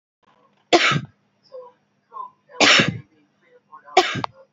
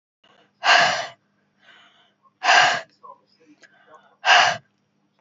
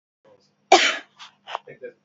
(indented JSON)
{
  "three_cough_length": "4.5 s",
  "three_cough_amplitude": 32767,
  "three_cough_signal_mean_std_ratio": 0.35,
  "exhalation_length": "5.2 s",
  "exhalation_amplitude": 28521,
  "exhalation_signal_mean_std_ratio": 0.36,
  "cough_length": "2.0 s",
  "cough_amplitude": 28419,
  "cough_signal_mean_std_ratio": 0.28,
  "survey_phase": "beta (2021-08-13 to 2022-03-07)",
  "age": "18-44",
  "gender": "Female",
  "wearing_mask": "No",
  "symptom_fatigue": true,
  "symptom_headache": true,
  "symptom_onset": "11 days",
  "smoker_status": "Never smoked",
  "respiratory_condition_asthma": false,
  "respiratory_condition_other": false,
  "recruitment_source": "REACT",
  "submission_delay": "4 days",
  "covid_test_result": "Negative",
  "covid_test_method": "RT-qPCR"
}